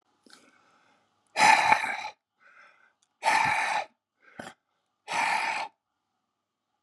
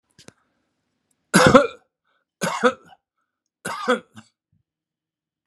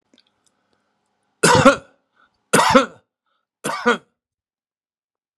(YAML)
exhalation_length: 6.8 s
exhalation_amplitude: 24206
exhalation_signal_mean_std_ratio: 0.39
cough_length: 5.5 s
cough_amplitude: 32768
cough_signal_mean_std_ratio: 0.27
three_cough_length: 5.4 s
three_cough_amplitude: 32767
three_cough_signal_mean_std_ratio: 0.3
survey_phase: beta (2021-08-13 to 2022-03-07)
age: 65+
gender: Male
wearing_mask: 'No'
symptom_none: true
smoker_status: Ex-smoker
respiratory_condition_asthma: false
respiratory_condition_other: false
recruitment_source: REACT
submission_delay: 2 days
covid_test_result: Negative
covid_test_method: RT-qPCR